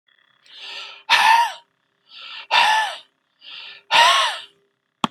exhalation_length: 5.1 s
exhalation_amplitude: 32270
exhalation_signal_mean_std_ratio: 0.45
survey_phase: beta (2021-08-13 to 2022-03-07)
age: 45-64
gender: Male
wearing_mask: 'No'
symptom_none: true
smoker_status: Never smoked
respiratory_condition_asthma: false
respiratory_condition_other: false
recruitment_source: REACT
submission_delay: 2 days
covid_test_result: Negative
covid_test_method: RT-qPCR
influenza_a_test_result: Negative
influenza_b_test_result: Negative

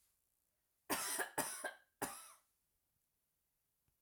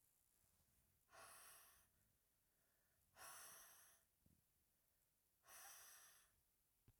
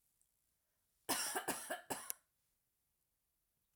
three_cough_length: 4.0 s
three_cough_amplitude: 1904
three_cough_signal_mean_std_ratio: 0.37
exhalation_length: 7.0 s
exhalation_amplitude: 115
exhalation_signal_mean_std_ratio: 0.59
cough_length: 3.8 s
cough_amplitude: 3877
cough_signal_mean_std_ratio: 0.36
survey_phase: alpha (2021-03-01 to 2021-08-12)
age: 18-44
gender: Female
wearing_mask: 'No'
symptom_none: true
smoker_status: Never smoked
respiratory_condition_asthma: false
respiratory_condition_other: false
recruitment_source: REACT
submission_delay: 2 days
covid_test_result: Negative
covid_test_method: RT-qPCR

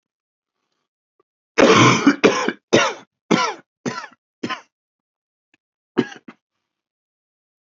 cough_length: 7.8 s
cough_amplitude: 29753
cough_signal_mean_std_ratio: 0.32
survey_phase: beta (2021-08-13 to 2022-03-07)
age: 45-64
gender: Male
wearing_mask: 'No'
symptom_cough_any: true
symptom_shortness_of_breath: true
symptom_sore_throat: true
symptom_fatigue: true
symptom_headache: true
smoker_status: Never smoked
respiratory_condition_asthma: true
respiratory_condition_other: false
recruitment_source: Test and Trace
submission_delay: 1 day
covid_test_result: Positive
covid_test_method: RT-qPCR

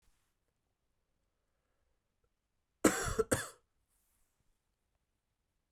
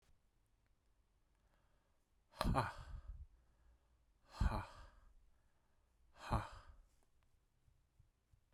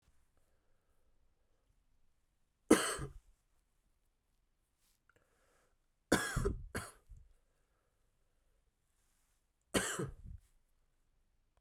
cough_length: 5.7 s
cough_amplitude: 9592
cough_signal_mean_std_ratio: 0.2
exhalation_length: 8.5 s
exhalation_amplitude: 3524
exhalation_signal_mean_std_ratio: 0.3
three_cough_length: 11.6 s
three_cough_amplitude: 8358
three_cough_signal_mean_std_ratio: 0.23
survey_phase: beta (2021-08-13 to 2022-03-07)
age: 18-44
gender: Male
wearing_mask: 'No'
symptom_cough_any: true
symptom_runny_or_blocked_nose: true
symptom_sore_throat: true
symptom_fatigue: true
symptom_headache: true
smoker_status: Never smoked
respiratory_condition_asthma: false
respiratory_condition_other: false
recruitment_source: Test and Trace
submission_delay: 2 days
covid_test_result: Positive
covid_test_method: RT-qPCR
covid_ct_value: 23.1
covid_ct_gene: ORF1ab gene
covid_ct_mean: 23.7
covid_viral_load: 17000 copies/ml
covid_viral_load_category: Low viral load (10K-1M copies/ml)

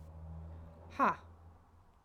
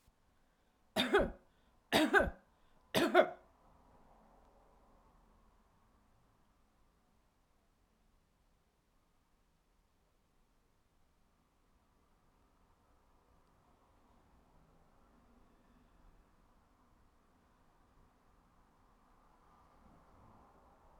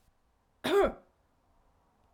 exhalation_length: 2.0 s
exhalation_amplitude: 3870
exhalation_signal_mean_std_ratio: 0.4
three_cough_length: 21.0 s
three_cough_amplitude: 6347
three_cough_signal_mean_std_ratio: 0.2
cough_length: 2.1 s
cough_amplitude: 5599
cough_signal_mean_std_ratio: 0.3
survey_phase: alpha (2021-03-01 to 2021-08-12)
age: 45-64
gender: Female
wearing_mask: 'No'
symptom_none: true
smoker_status: Ex-smoker
respiratory_condition_asthma: false
respiratory_condition_other: false
recruitment_source: REACT
submission_delay: 4 days
covid_test_result: Negative
covid_test_method: RT-qPCR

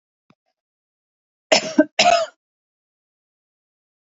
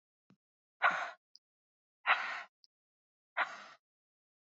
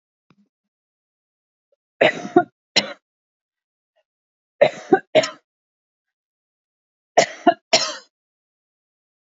cough_length: 4.1 s
cough_amplitude: 27338
cough_signal_mean_std_ratio: 0.26
exhalation_length: 4.4 s
exhalation_amplitude: 6906
exhalation_signal_mean_std_ratio: 0.29
three_cough_length: 9.4 s
three_cough_amplitude: 32669
three_cough_signal_mean_std_ratio: 0.23
survey_phase: beta (2021-08-13 to 2022-03-07)
age: 18-44
gender: Female
wearing_mask: 'No'
symptom_none: true
smoker_status: Prefer not to say
respiratory_condition_asthma: false
respiratory_condition_other: false
recruitment_source: REACT
submission_delay: 1 day
covid_test_result: Negative
covid_test_method: RT-qPCR
influenza_a_test_result: Negative
influenza_b_test_result: Negative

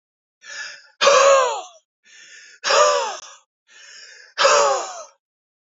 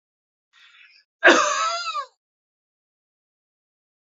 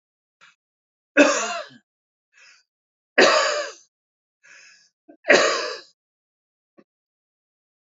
exhalation_length: 5.7 s
exhalation_amplitude: 27393
exhalation_signal_mean_std_ratio: 0.46
cough_length: 4.2 s
cough_amplitude: 27108
cough_signal_mean_std_ratio: 0.29
three_cough_length: 7.9 s
three_cough_amplitude: 29053
three_cough_signal_mean_std_ratio: 0.3
survey_phase: beta (2021-08-13 to 2022-03-07)
age: 45-64
gender: Male
wearing_mask: 'No'
symptom_none: true
smoker_status: Never smoked
respiratory_condition_asthma: true
respiratory_condition_other: false
recruitment_source: REACT
submission_delay: 3 days
covid_test_result: Negative
covid_test_method: RT-qPCR
influenza_a_test_result: Negative
influenza_b_test_result: Negative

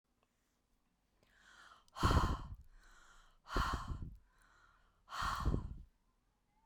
exhalation_length: 6.7 s
exhalation_amplitude: 3567
exhalation_signal_mean_std_ratio: 0.39
survey_phase: beta (2021-08-13 to 2022-03-07)
age: 45-64
gender: Female
wearing_mask: 'No'
symptom_none: true
smoker_status: Ex-smoker
respiratory_condition_asthma: false
respiratory_condition_other: false
recruitment_source: REACT
submission_delay: 2 days
covid_test_result: Negative
covid_test_method: RT-qPCR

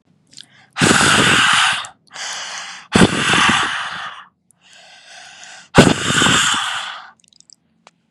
exhalation_length: 8.1 s
exhalation_amplitude: 32768
exhalation_signal_mean_std_ratio: 0.54
survey_phase: beta (2021-08-13 to 2022-03-07)
age: 18-44
gender: Female
wearing_mask: 'No'
symptom_none: true
smoker_status: Never smoked
respiratory_condition_asthma: false
respiratory_condition_other: false
recruitment_source: REACT
submission_delay: 0 days
covid_test_result: Negative
covid_test_method: RT-qPCR
influenza_a_test_result: Negative
influenza_b_test_result: Negative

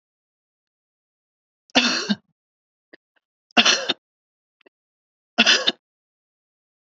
three_cough_length: 7.0 s
three_cough_amplitude: 29766
three_cough_signal_mean_std_ratio: 0.26
survey_phase: beta (2021-08-13 to 2022-03-07)
age: 45-64
gender: Female
wearing_mask: 'No'
symptom_cough_any: true
symptom_sore_throat: true
symptom_change_to_sense_of_smell_or_taste: true
symptom_onset: 4 days
smoker_status: Never smoked
respiratory_condition_asthma: false
respiratory_condition_other: false
recruitment_source: Test and Trace
submission_delay: 1 day
covid_test_result: Positive
covid_test_method: RT-qPCR
covid_ct_value: 14.7
covid_ct_gene: ORF1ab gene
covid_ct_mean: 14.9
covid_viral_load: 13000000 copies/ml
covid_viral_load_category: High viral load (>1M copies/ml)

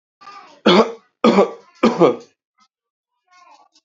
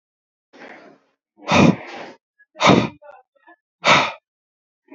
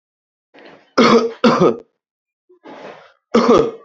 three_cough_length: 3.8 s
three_cough_amplitude: 32118
three_cough_signal_mean_std_ratio: 0.36
exhalation_length: 4.9 s
exhalation_amplitude: 32236
exhalation_signal_mean_std_ratio: 0.33
cough_length: 3.8 s
cough_amplitude: 29826
cough_signal_mean_std_ratio: 0.43
survey_phase: beta (2021-08-13 to 2022-03-07)
age: 18-44
gender: Male
wearing_mask: 'No'
symptom_none: true
symptom_onset: 13 days
smoker_status: Current smoker (11 or more cigarettes per day)
respiratory_condition_asthma: false
respiratory_condition_other: false
recruitment_source: REACT
submission_delay: 2 days
covid_test_result: Negative
covid_test_method: RT-qPCR
influenza_a_test_result: Negative
influenza_b_test_result: Negative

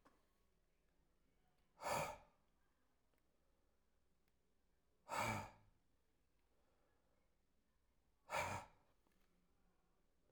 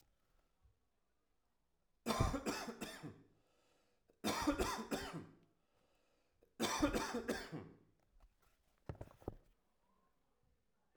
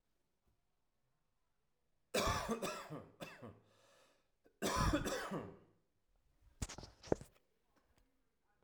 exhalation_length: 10.3 s
exhalation_amplitude: 1002
exhalation_signal_mean_std_ratio: 0.29
three_cough_length: 11.0 s
three_cough_amplitude: 2439
three_cough_signal_mean_std_ratio: 0.4
cough_length: 8.6 s
cough_amplitude: 4651
cough_signal_mean_std_ratio: 0.37
survey_phase: alpha (2021-03-01 to 2021-08-12)
age: 45-64
gender: Male
wearing_mask: 'No'
symptom_fatigue: true
symptom_headache: true
symptom_onset: 12 days
smoker_status: Never smoked
respiratory_condition_asthma: true
respiratory_condition_other: false
recruitment_source: REACT
submission_delay: 1 day
covid_test_result: Negative
covid_test_method: RT-qPCR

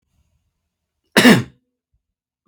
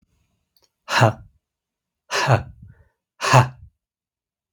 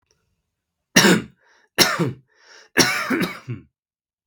cough_length: 2.5 s
cough_amplitude: 32766
cough_signal_mean_std_ratio: 0.25
exhalation_length: 4.5 s
exhalation_amplitude: 32766
exhalation_signal_mean_std_ratio: 0.31
three_cough_length: 4.3 s
three_cough_amplitude: 32768
three_cough_signal_mean_std_ratio: 0.39
survey_phase: beta (2021-08-13 to 2022-03-07)
age: 45-64
gender: Male
wearing_mask: 'No'
symptom_runny_or_blocked_nose: true
symptom_sore_throat: true
symptom_onset: 12 days
smoker_status: Never smoked
respiratory_condition_asthma: false
respiratory_condition_other: false
recruitment_source: REACT
submission_delay: 1 day
covid_test_result: Negative
covid_test_method: RT-qPCR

